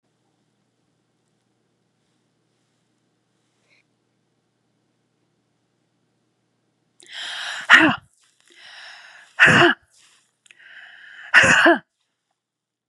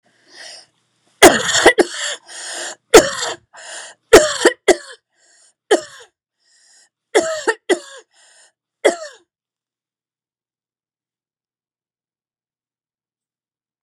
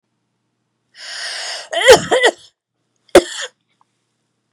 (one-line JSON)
{"exhalation_length": "12.9 s", "exhalation_amplitude": 32768, "exhalation_signal_mean_std_ratio": 0.25, "three_cough_length": "13.8 s", "three_cough_amplitude": 32768, "three_cough_signal_mean_std_ratio": 0.27, "cough_length": "4.5 s", "cough_amplitude": 32768, "cough_signal_mean_std_ratio": 0.31, "survey_phase": "beta (2021-08-13 to 2022-03-07)", "age": "45-64", "gender": "Female", "wearing_mask": "No", "symptom_none": true, "smoker_status": "Never smoked", "respiratory_condition_asthma": false, "respiratory_condition_other": false, "recruitment_source": "REACT", "submission_delay": "2 days", "covid_test_result": "Negative", "covid_test_method": "RT-qPCR", "influenza_a_test_result": "Negative", "influenza_b_test_result": "Negative"}